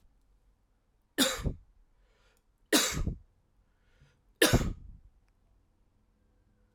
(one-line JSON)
{"three_cough_length": "6.7 s", "three_cough_amplitude": 13324, "three_cough_signal_mean_std_ratio": 0.3, "survey_phase": "alpha (2021-03-01 to 2021-08-12)", "age": "45-64", "gender": "Male", "wearing_mask": "No", "symptom_cough_any": true, "symptom_change_to_sense_of_smell_or_taste": true, "symptom_onset": "7 days", "smoker_status": "Ex-smoker", "respiratory_condition_asthma": false, "respiratory_condition_other": false, "recruitment_source": "Test and Trace", "submission_delay": "2 days", "covid_test_result": "Positive", "covid_test_method": "RT-qPCR"}